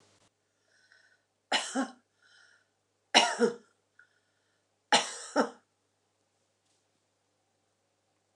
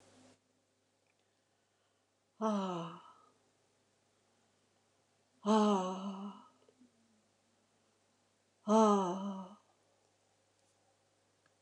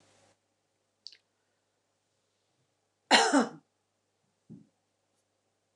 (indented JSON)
{
  "three_cough_length": "8.4 s",
  "three_cough_amplitude": 17544,
  "three_cough_signal_mean_std_ratio": 0.25,
  "exhalation_length": "11.6 s",
  "exhalation_amplitude": 5065,
  "exhalation_signal_mean_std_ratio": 0.3,
  "cough_length": "5.8 s",
  "cough_amplitude": 13930,
  "cough_signal_mean_std_ratio": 0.2,
  "survey_phase": "beta (2021-08-13 to 2022-03-07)",
  "age": "65+",
  "gender": "Female",
  "wearing_mask": "No",
  "symptom_none": true,
  "smoker_status": "Never smoked",
  "respiratory_condition_asthma": false,
  "respiratory_condition_other": false,
  "recruitment_source": "REACT",
  "submission_delay": "2 days",
  "covid_test_result": "Negative",
  "covid_test_method": "RT-qPCR"
}